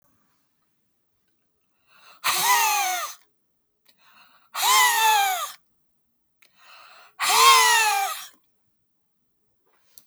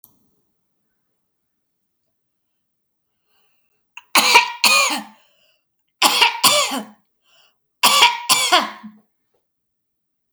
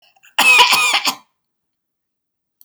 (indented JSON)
{
  "exhalation_length": "10.1 s",
  "exhalation_amplitude": 23378,
  "exhalation_signal_mean_std_ratio": 0.43,
  "three_cough_length": "10.3 s",
  "three_cough_amplitude": 32768,
  "three_cough_signal_mean_std_ratio": 0.35,
  "cough_length": "2.6 s",
  "cough_amplitude": 32767,
  "cough_signal_mean_std_ratio": 0.42,
  "survey_phase": "beta (2021-08-13 to 2022-03-07)",
  "age": "65+",
  "gender": "Female",
  "wearing_mask": "No",
  "symptom_none": true,
  "smoker_status": "Never smoked",
  "respiratory_condition_asthma": false,
  "respiratory_condition_other": false,
  "recruitment_source": "REACT",
  "submission_delay": "1 day",
  "covid_test_result": "Negative",
  "covid_test_method": "RT-qPCR"
}